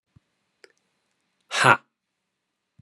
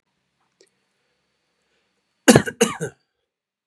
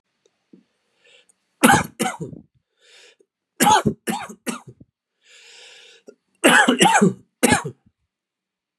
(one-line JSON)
{"exhalation_length": "2.8 s", "exhalation_amplitude": 31433, "exhalation_signal_mean_std_ratio": 0.2, "cough_length": "3.7 s", "cough_amplitude": 32768, "cough_signal_mean_std_ratio": 0.2, "three_cough_length": "8.8 s", "three_cough_amplitude": 32767, "three_cough_signal_mean_std_ratio": 0.35, "survey_phase": "beta (2021-08-13 to 2022-03-07)", "age": "45-64", "gender": "Male", "wearing_mask": "No", "symptom_cough_any": true, "symptom_new_continuous_cough": true, "symptom_runny_or_blocked_nose": true, "symptom_sore_throat": true, "symptom_headache": true, "symptom_onset": "5 days", "smoker_status": "Ex-smoker", "respiratory_condition_asthma": false, "respiratory_condition_other": false, "recruitment_source": "Test and Trace", "submission_delay": "1 day", "covid_test_result": "Positive", "covid_test_method": "RT-qPCR", "covid_ct_value": 17.1, "covid_ct_gene": "ORF1ab gene", "covid_ct_mean": 17.4, "covid_viral_load": "2000000 copies/ml", "covid_viral_load_category": "High viral load (>1M copies/ml)"}